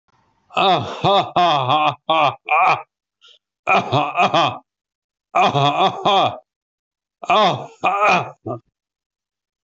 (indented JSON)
{
  "cough_length": "9.6 s",
  "cough_amplitude": 24074,
  "cough_signal_mean_std_ratio": 0.58,
  "survey_phase": "beta (2021-08-13 to 2022-03-07)",
  "age": "45-64",
  "gender": "Male",
  "wearing_mask": "No",
  "symptom_none": true,
  "smoker_status": "Ex-smoker",
  "respiratory_condition_asthma": false,
  "respiratory_condition_other": false,
  "recruitment_source": "REACT",
  "submission_delay": "4 days",
  "covid_test_result": "Negative",
  "covid_test_method": "RT-qPCR"
}